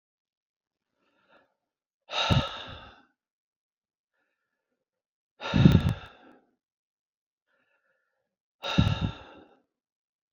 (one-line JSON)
{"exhalation_length": "10.3 s", "exhalation_amplitude": 21042, "exhalation_signal_mean_std_ratio": 0.25, "survey_phase": "beta (2021-08-13 to 2022-03-07)", "age": "65+", "gender": "Male", "wearing_mask": "No", "symptom_none": true, "smoker_status": "Ex-smoker", "respiratory_condition_asthma": false, "respiratory_condition_other": false, "recruitment_source": "REACT", "submission_delay": "1 day", "covid_test_result": "Negative", "covid_test_method": "RT-qPCR", "influenza_a_test_result": "Negative", "influenza_b_test_result": "Negative"}